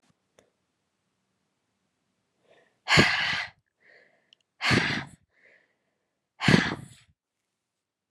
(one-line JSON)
{"exhalation_length": "8.1 s", "exhalation_amplitude": 20132, "exhalation_signal_mean_std_ratio": 0.29, "survey_phase": "alpha (2021-03-01 to 2021-08-12)", "age": "18-44", "gender": "Female", "wearing_mask": "No", "symptom_cough_any": true, "symptom_fatigue": true, "symptom_fever_high_temperature": true, "symptom_headache": true, "symptom_onset": "3 days", "smoker_status": "Ex-smoker", "respiratory_condition_asthma": false, "respiratory_condition_other": false, "recruitment_source": "Test and Trace", "submission_delay": "2 days", "covid_test_result": "Positive", "covid_test_method": "RT-qPCR", "covid_ct_value": 28.0, "covid_ct_gene": "ORF1ab gene"}